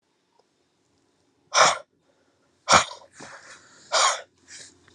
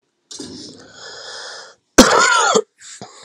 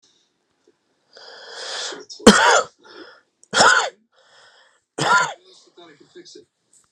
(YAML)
exhalation_length: 4.9 s
exhalation_amplitude: 24795
exhalation_signal_mean_std_ratio: 0.29
cough_length: 3.2 s
cough_amplitude: 32768
cough_signal_mean_std_ratio: 0.41
three_cough_length: 6.9 s
three_cough_amplitude: 32768
three_cough_signal_mean_std_ratio: 0.33
survey_phase: alpha (2021-03-01 to 2021-08-12)
age: 18-44
gender: Male
wearing_mask: 'No'
symptom_none: true
smoker_status: Current smoker (1 to 10 cigarettes per day)
respiratory_condition_asthma: false
respiratory_condition_other: false
recruitment_source: REACT
submission_delay: 2 days
covid_test_result: Negative
covid_test_method: RT-qPCR